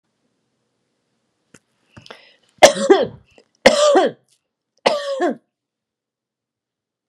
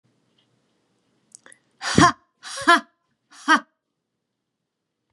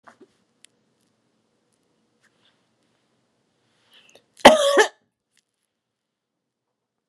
{"three_cough_length": "7.1 s", "three_cough_amplitude": 32768, "three_cough_signal_mean_std_ratio": 0.3, "exhalation_length": "5.1 s", "exhalation_amplitude": 29643, "exhalation_signal_mean_std_ratio": 0.24, "cough_length": "7.1 s", "cough_amplitude": 32768, "cough_signal_mean_std_ratio": 0.17, "survey_phase": "beta (2021-08-13 to 2022-03-07)", "age": "45-64", "gender": "Female", "wearing_mask": "No", "symptom_none": true, "symptom_onset": "4 days", "smoker_status": "Ex-smoker", "respiratory_condition_asthma": false, "respiratory_condition_other": false, "recruitment_source": "REACT", "submission_delay": "1 day", "covid_test_result": "Negative", "covid_test_method": "RT-qPCR"}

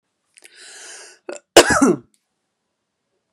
{"cough_length": "3.3 s", "cough_amplitude": 32768, "cough_signal_mean_std_ratio": 0.26, "survey_phase": "beta (2021-08-13 to 2022-03-07)", "age": "45-64", "gender": "Female", "wearing_mask": "No", "symptom_runny_or_blocked_nose": true, "symptom_onset": "5 days", "smoker_status": "Never smoked", "respiratory_condition_asthma": true, "respiratory_condition_other": false, "recruitment_source": "REACT", "submission_delay": "2 days", "covid_test_result": "Negative", "covid_test_method": "RT-qPCR", "influenza_a_test_result": "Negative", "influenza_b_test_result": "Negative"}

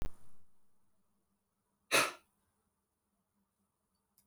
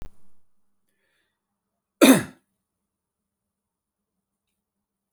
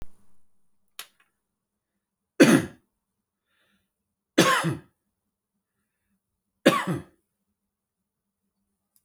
{"exhalation_length": "4.3 s", "exhalation_amplitude": 6526, "exhalation_signal_mean_std_ratio": 0.28, "cough_length": "5.1 s", "cough_amplitude": 27464, "cough_signal_mean_std_ratio": 0.17, "three_cough_length": "9.0 s", "three_cough_amplitude": 24745, "three_cough_signal_mean_std_ratio": 0.23, "survey_phase": "beta (2021-08-13 to 2022-03-07)", "age": "45-64", "gender": "Male", "wearing_mask": "No", "symptom_none": true, "smoker_status": "Ex-smoker", "respiratory_condition_asthma": false, "respiratory_condition_other": false, "recruitment_source": "REACT", "submission_delay": "1 day", "covid_test_result": "Negative", "covid_test_method": "RT-qPCR"}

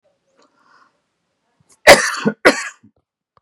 {"cough_length": "3.4 s", "cough_amplitude": 32768, "cough_signal_mean_std_ratio": 0.26, "survey_phase": "beta (2021-08-13 to 2022-03-07)", "age": "45-64", "gender": "Male", "wearing_mask": "No", "symptom_none": true, "smoker_status": "Never smoked", "respiratory_condition_asthma": false, "respiratory_condition_other": false, "recruitment_source": "REACT", "submission_delay": "2 days", "covid_test_result": "Negative", "covid_test_method": "RT-qPCR", "influenza_a_test_result": "Unknown/Void", "influenza_b_test_result": "Unknown/Void"}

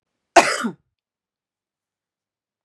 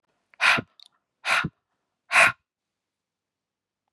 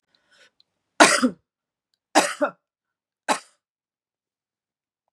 {"cough_length": "2.6 s", "cough_amplitude": 32767, "cough_signal_mean_std_ratio": 0.21, "exhalation_length": "3.9 s", "exhalation_amplitude": 20876, "exhalation_signal_mean_std_ratio": 0.3, "three_cough_length": "5.1 s", "three_cough_amplitude": 32532, "three_cough_signal_mean_std_ratio": 0.24, "survey_phase": "beta (2021-08-13 to 2022-03-07)", "age": "45-64", "gender": "Female", "wearing_mask": "No", "symptom_none": true, "smoker_status": "Never smoked", "respiratory_condition_asthma": false, "respiratory_condition_other": false, "recruitment_source": "REACT", "submission_delay": "1 day", "covid_test_result": "Negative", "covid_test_method": "RT-qPCR", "influenza_a_test_result": "Negative", "influenza_b_test_result": "Negative"}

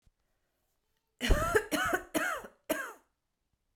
{"cough_length": "3.8 s", "cough_amplitude": 9561, "cough_signal_mean_std_ratio": 0.42, "survey_phase": "beta (2021-08-13 to 2022-03-07)", "age": "18-44", "gender": "Male", "wearing_mask": "No", "symptom_cough_any": true, "symptom_new_continuous_cough": true, "symptom_runny_or_blocked_nose": true, "symptom_shortness_of_breath": true, "symptom_sore_throat": true, "symptom_fatigue": true, "symptom_headache": true, "symptom_change_to_sense_of_smell_or_taste": true, "symptom_loss_of_taste": true, "symptom_onset": "6 days", "smoker_status": "Ex-smoker", "respiratory_condition_asthma": false, "respiratory_condition_other": false, "recruitment_source": "Test and Trace", "submission_delay": "2 days", "covid_test_method": "RT-qPCR"}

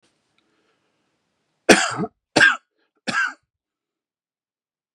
{"three_cough_length": "4.9 s", "three_cough_amplitude": 32768, "three_cough_signal_mean_std_ratio": 0.26, "survey_phase": "beta (2021-08-13 to 2022-03-07)", "age": "45-64", "gender": "Male", "wearing_mask": "No", "symptom_none": true, "symptom_onset": "12 days", "smoker_status": "Never smoked", "respiratory_condition_asthma": false, "respiratory_condition_other": false, "recruitment_source": "REACT", "submission_delay": "2 days", "covid_test_result": "Negative", "covid_test_method": "RT-qPCR", "influenza_a_test_result": "Negative", "influenza_b_test_result": "Negative"}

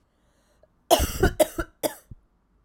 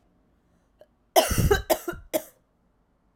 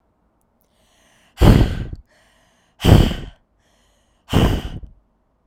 {"cough_length": "2.6 s", "cough_amplitude": 23195, "cough_signal_mean_std_ratio": 0.33, "three_cough_length": "3.2 s", "three_cough_amplitude": 21669, "three_cough_signal_mean_std_ratio": 0.34, "exhalation_length": "5.5 s", "exhalation_amplitude": 32768, "exhalation_signal_mean_std_ratio": 0.34, "survey_phase": "beta (2021-08-13 to 2022-03-07)", "age": "18-44", "gender": "Female", "wearing_mask": "No", "symptom_cough_any": true, "symptom_runny_or_blocked_nose": true, "symptom_fatigue": true, "symptom_headache": true, "symptom_change_to_sense_of_smell_or_taste": true, "smoker_status": "Never smoked", "respiratory_condition_asthma": false, "respiratory_condition_other": false, "recruitment_source": "Test and Trace", "submission_delay": "2 days", "covid_test_result": "Positive", "covid_test_method": "RT-qPCR", "covid_ct_value": 19.1, "covid_ct_gene": "ORF1ab gene", "covid_ct_mean": 20.2, "covid_viral_load": "230000 copies/ml", "covid_viral_load_category": "Low viral load (10K-1M copies/ml)"}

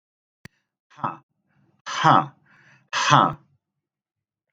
{"exhalation_length": "4.5 s", "exhalation_amplitude": 30725, "exhalation_signal_mean_std_ratio": 0.29, "survey_phase": "alpha (2021-03-01 to 2021-08-12)", "age": "45-64", "gender": "Male", "wearing_mask": "No", "symptom_none": true, "symptom_onset": "6 days", "smoker_status": "Ex-smoker", "respiratory_condition_asthma": false, "respiratory_condition_other": false, "recruitment_source": "REACT", "submission_delay": "1 day", "covid_test_result": "Negative", "covid_test_method": "RT-qPCR"}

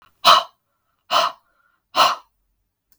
{"exhalation_length": "3.0 s", "exhalation_amplitude": 32768, "exhalation_signal_mean_std_ratio": 0.33, "survey_phase": "beta (2021-08-13 to 2022-03-07)", "age": "45-64", "gender": "Female", "wearing_mask": "No", "symptom_none": true, "smoker_status": "Never smoked", "respiratory_condition_asthma": true, "respiratory_condition_other": false, "recruitment_source": "REACT", "submission_delay": "1 day", "covid_test_result": "Negative", "covid_test_method": "RT-qPCR"}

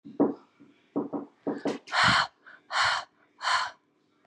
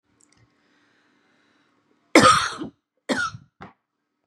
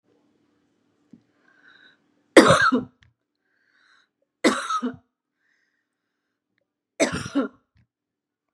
{"exhalation_length": "4.3 s", "exhalation_amplitude": 11124, "exhalation_signal_mean_std_ratio": 0.49, "cough_length": "4.3 s", "cough_amplitude": 32652, "cough_signal_mean_std_ratio": 0.27, "three_cough_length": "8.5 s", "three_cough_amplitude": 32768, "three_cough_signal_mean_std_ratio": 0.25, "survey_phase": "beta (2021-08-13 to 2022-03-07)", "age": "45-64", "gender": "Female", "wearing_mask": "No", "symptom_none": true, "smoker_status": "Ex-smoker", "respiratory_condition_asthma": true, "respiratory_condition_other": false, "recruitment_source": "REACT", "submission_delay": "6 days", "covid_test_result": "Negative", "covid_test_method": "RT-qPCR", "influenza_a_test_result": "Negative", "influenza_b_test_result": "Negative"}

